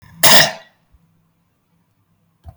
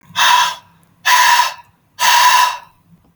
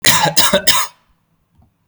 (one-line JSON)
{"cough_length": "2.6 s", "cough_amplitude": 32766, "cough_signal_mean_std_ratio": 0.27, "exhalation_length": "3.2 s", "exhalation_amplitude": 32767, "exhalation_signal_mean_std_ratio": 0.61, "three_cough_length": "1.9 s", "three_cough_amplitude": 32766, "three_cough_signal_mean_std_ratio": 0.51, "survey_phase": "beta (2021-08-13 to 2022-03-07)", "age": "18-44", "gender": "Male", "wearing_mask": "No", "symptom_none": true, "smoker_status": "Never smoked", "respiratory_condition_asthma": false, "respiratory_condition_other": false, "recruitment_source": "REACT", "submission_delay": "0 days", "covid_test_result": "Negative", "covid_test_method": "RT-qPCR"}